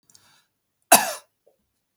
{"cough_length": "2.0 s", "cough_amplitude": 32638, "cough_signal_mean_std_ratio": 0.2, "survey_phase": "beta (2021-08-13 to 2022-03-07)", "age": "45-64", "gender": "Male", "wearing_mask": "No", "symptom_none": true, "smoker_status": "Never smoked", "respiratory_condition_asthma": false, "respiratory_condition_other": false, "recruitment_source": "REACT", "submission_delay": "1 day", "covid_test_result": "Negative", "covid_test_method": "RT-qPCR", "influenza_a_test_result": "Negative", "influenza_b_test_result": "Negative"}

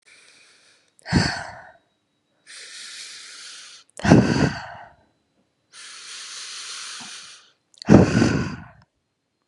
{"exhalation_length": "9.5 s", "exhalation_amplitude": 32767, "exhalation_signal_mean_std_ratio": 0.33, "survey_phase": "beta (2021-08-13 to 2022-03-07)", "age": "18-44", "gender": "Female", "wearing_mask": "No", "symptom_cough_any": true, "symptom_runny_or_blocked_nose": true, "symptom_shortness_of_breath": true, "symptom_sore_throat": true, "symptom_abdominal_pain": true, "symptom_fatigue": true, "symptom_headache": true, "symptom_change_to_sense_of_smell_or_taste": true, "symptom_onset": "6 days", "smoker_status": "Ex-smoker", "respiratory_condition_asthma": false, "respiratory_condition_other": false, "recruitment_source": "Test and Trace", "submission_delay": "2 days", "covid_test_result": "Positive", "covid_test_method": "RT-qPCR", "covid_ct_value": 18.7, "covid_ct_gene": "N gene", "covid_ct_mean": 19.6, "covid_viral_load": "390000 copies/ml", "covid_viral_load_category": "Low viral load (10K-1M copies/ml)"}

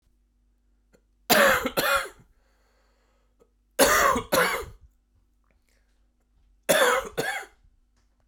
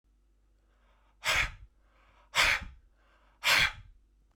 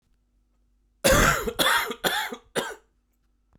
{"three_cough_length": "8.3 s", "three_cough_amplitude": 27058, "three_cough_signal_mean_std_ratio": 0.39, "exhalation_length": "4.4 s", "exhalation_amplitude": 8680, "exhalation_signal_mean_std_ratio": 0.36, "cough_length": "3.6 s", "cough_amplitude": 16669, "cough_signal_mean_std_ratio": 0.46, "survey_phase": "beta (2021-08-13 to 2022-03-07)", "age": "45-64", "gender": "Male", "wearing_mask": "No", "symptom_cough_any": true, "symptom_new_continuous_cough": true, "symptom_shortness_of_breath": true, "symptom_headache": true, "symptom_other": true, "symptom_onset": "5 days", "smoker_status": "Never smoked", "respiratory_condition_asthma": false, "respiratory_condition_other": false, "recruitment_source": "Test and Trace", "submission_delay": "2 days", "covid_test_result": "Positive", "covid_test_method": "RT-qPCR"}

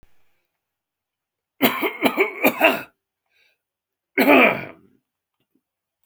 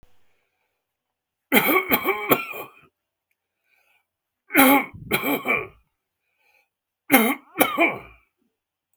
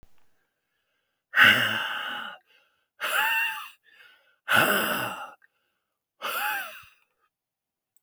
{"cough_length": "6.1 s", "cough_amplitude": 28246, "cough_signal_mean_std_ratio": 0.34, "three_cough_length": "9.0 s", "three_cough_amplitude": 32767, "three_cough_signal_mean_std_ratio": 0.37, "exhalation_length": "8.0 s", "exhalation_amplitude": 20361, "exhalation_signal_mean_std_ratio": 0.42, "survey_phase": "alpha (2021-03-01 to 2021-08-12)", "age": "65+", "gender": "Male", "wearing_mask": "No", "symptom_none": true, "smoker_status": "Never smoked", "respiratory_condition_asthma": false, "respiratory_condition_other": false, "recruitment_source": "REACT", "submission_delay": "3 days", "covid_test_result": "Negative", "covid_test_method": "RT-qPCR"}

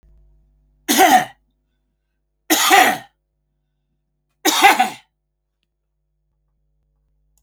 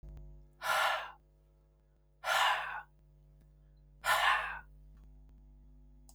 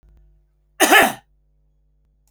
{"three_cough_length": "7.4 s", "three_cough_amplitude": 32767, "three_cough_signal_mean_std_ratio": 0.32, "exhalation_length": "6.1 s", "exhalation_amplitude": 4915, "exhalation_signal_mean_std_ratio": 0.45, "cough_length": "2.3 s", "cough_amplitude": 31098, "cough_signal_mean_std_ratio": 0.29, "survey_phase": "beta (2021-08-13 to 2022-03-07)", "age": "45-64", "gender": "Male", "wearing_mask": "No", "symptom_none": true, "smoker_status": "Ex-smoker", "respiratory_condition_asthma": false, "respiratory_condition_other": false, "recruitment_source": "REACT", "submission_delay": "0 days", "covid_test_result": "Negative", "covid_test_method": "RT-qPCR"}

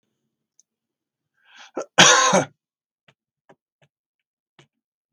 {"exhalation_length": "5.1 s", "exhalation_amplitude": 32768, "exhalation_signal_mean_std_ratio": 0.24, "survey_phase": "beta (2021-08-13 to 2022-03-07)", "age": "65+", "gender": "Male", "wearing_mask": "No", "symptom_none": true, "smoker_status": "Never smoked", "respiratory_condition_asthma": false, "respiratory_condition_other": false, "recruitment_source": "REACT", "submission_delay": "5 days", "covid_test_result": "Negative", "covid_test_method": "RT-qPCR", "influenza_a_test_result": "Negative", "influenza_b_test_result": "Negative"}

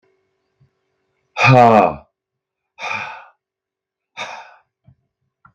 {"exhalation_length": "5.5 s", "exhalation_amplitude": 32768, "exhalation_signal_mean_std_ratio": 0.29, "survey_phase": "beta (2021-08-13 to 2022-03-07)", "age": "45-64", "gender": "Male", "wearing_mask": "No", "symptom_none": true, "smoker_status": "Ex-smoker", "respiratory_condition_asthma": false, "respiratory_condition_other": false, "recruitment_source": "REACT", "submission_delay": "1 day", "covid_test_result": "Negative", "covid_test_method": "RT-qPCR", "influenza_a_test_result": "Unknown/Void", "influenza_b_test_result": "Unknown/Void"}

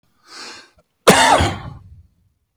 {"cough_length": "2.6 s", "cough_amplitude": 32767, "cough_signal_mean_std_ratio": 0.38, "survey_phase": "alpha (2021-03-01 to 2021-08-12)", "age": "65+", "gender": "Male", "wearing_mask": "No", "symptom_none": true, "smoker_status": "Ex-smoker", "respiratory_condition_asthma": false, "respiratory_condition_other": false, "recruitment_source": "REACT", "submission_delay": "2 days", "covid_test_result": "Negative", "covid_test_method": "RT-qPCR"}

